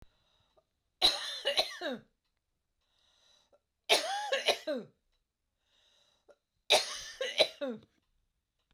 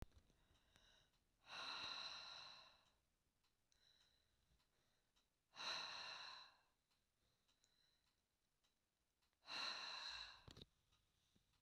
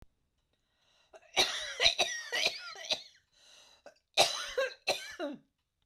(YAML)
three_cough_length: 8.7 s
three_cough_amplitude: 10252
three_cough_signal_mean_std_ratio: 0.35
exhalation_length: 11.6 s
exhalation_amplitude: 459
exhalation_signal_mean_std_ratio: 0.45
cough_length: 5.9 s
cough_amplitude: 11812
cough_signal_mean_std_ratio: 0.42
survey_phase: beta (2021-08-13 to 2022-03-07)
age: 45-64
gender: Female
wearing_mask: 'No'
symptom_shortness_of_breath: true
symptom_fatigue: true
symptom_fever_high_temperature: true
smoker_status: Ex-smoker
respiratory_condition_asthma: true
respiratory_condition_other: false
recruitment_source: REACT
submission_delay: 1 day
covid_test_result: Negative
covid_test_method: RT-qPCR